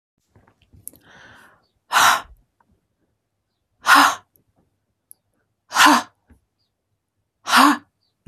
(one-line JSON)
{"exhalation_length": "8.3 s", "exhalation_amplitude": 32078, "exhalation_signal_mean_std_ratio": 0.29, "survey_phase": "beta (2021-08-13 to 2022-03-07)", "age": "18-44", "gender": "Female", "wearing_mask": "No", "symptom_runny_or_blocked_nose": true, "symptom_sore_throat": true, "smoker_status": "Ex-smoker", "respiratory_condition_asthma": false, "respiratory_condition_other": false, "recruitment_source": "REACT", "submission_delay": "2 days", "covid_test_result": "Negative", "covid_test_method": "RT-qPCR", "influenza_a_test_result": "Negative", "influenza_b_test_result": "Negative"}